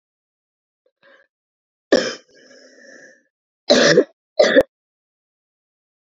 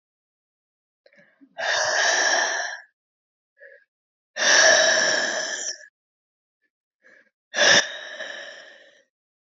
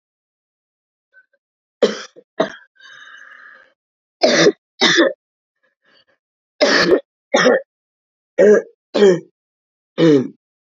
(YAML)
cough_length: 6.1 s
cough_amplitude: 29532
cough_signal_mean_std_ratio: 0.28
exhalation_length: 9.5 s
exhalation_amplitude: 22294
exhalation_signal_mean_std_ratio: 0.45
three_cough_length: 10.7 s
three_cough_amplitude: 30508
three_cough_signal_mean_std_ratio: 0.38
survey_phase: beta (2021-08-13 to 2022-03-07)
age: 18-44
gender: Female
wearing_mask: 'No'
symptom_cough_any: true
symptom_runny_or_blocked_nose: true
symptom_sore_throat: true
symptom_fatigue: true
symptom_fever_high_temperature: true
symptom_headache: true
symptom_onset: 4 days
smoker_status: Never smoked
respiratory_condition_asthma: false
respiratory_condition_other: false
recruitment_source: Test and Trace
submission_delay: 2 days
covid_test_result: Positive
covid_test_method: RT-qPCR
covid_ct_value: 15.8
covid_ct_gene: ORF1ab gene
covid_ct_mean: 16.0
covid_viral_load: 5700000 copies/ml
covid_viral_load_category: High viral load (>1M copies/ml)